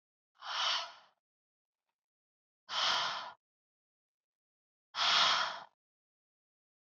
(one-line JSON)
{"exhalation_length": "7.0 s", "exhalation_amplitude": 5065, "exhalation_signal_mean_std_ratio": 0.37, "survey_phase": "beta (2021-08-13 to 2022-03-07)", "age": "18-44", "gender": "Female", "wearing_mask": "No", "symptom_cough_any": true, "symptom_runny_or_blocked_nose": true, "smoker_status": "Never smoked", "respiratory_condition_asthma": false, "respiratory_condition_other": false, "recruitment_source": "Test and Trace", "submission_delay": "2 days", "covid_test_result": "Positive", "covid_test_method": "RT-qPCR", "covid_ct_value": 16.7, "covid_ct_gene": "ORF1ab gene", "covid_ct_mean": 17.0, "covid_viral_load": "2600000 copies/ml", "covid_viral_load_category": "High viral load (>1M copies/ml)"}